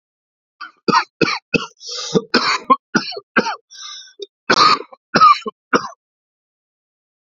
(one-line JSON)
{"three_cough_length": "7.3 s", "three_cough_amplitude": 31532, "three_cough_signal_mean_std_ratio": 0.39, "survey_phase": "beta (2021-08-13 to 2022-03-07)", "age": "45-64", "gender": "Male", "wearing_mask": "No", "symptom_cough_any": true, "symptom_runny_or_blocked_nose": true, "symptom_sore_throat": true, "symptom_abdominal_pain": true, "symptom_headache": true, "smoker_status": "Never smoked", "respiratory_condition_asthma": false, "respiratory_condition_other": false, "recruitment_source": "Test and Trace", "submission_delay": "1 day", "covid_test_result": "Positive", "covid_test_method": "LFT"}